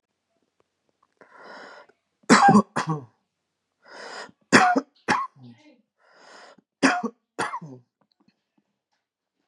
{"three_cough_length": "9.5 s", "three_cough_amplitude": 27654, "three_cough_signal_mean_std_ratio": 0.29, "survey_phase": "beta (2021-08-13 to 2022-03-07)", "age": "18-44", "gender": "Male", "wearing_mask": "No", "symptom_none": true, "smoker_status": "Current smoker (1 to 10 cigarettes per day)", "respiratory_condition_asthma": false, "respiratory_condition_other": false, "recruitment_source": "REACT", "submission_delay": "1 day", "covid_test_result": "Negative", "covid_test_method": "RT-qPCR", "influenza_a_test_result": "Unknown/Void", "influenza_b_test_result": "Unknown/Void"}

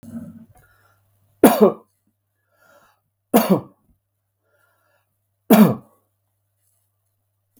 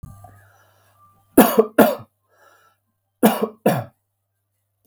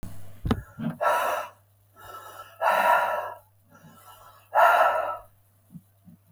{"three_cough_length": "7.6 s", "three_cough_amplitude": 32768, "three_cough_signal_mean_std_ratio": 0.24, "cough_length": "4.9 s", "cough_amplitude": 32768, "cough_signal_mean_std_ratio": 0.3, "exhalation_length": "6.3 s", "exhalation_amplitude": 16033, "exhalation_signal_mean_std_ratio": 0.5, "survey_phase": "beta (2021-08-13 to 2022-03-07)", "age": "45-64", "gender": "Male", "wearing_mask": "No", "symptom_none": true, "smoker_status": "Never smoked", "respiratory_condition_asthma": false, "respiratory_condition_other": false, "recruitment_source": "REACT", "submission_delay": "2 days", "covid_test_result": "Negative", "covid_test_method": "RT-qPCR", "influenza_a_test_result": "Negative", "influenza_b_test_result": "Negative"}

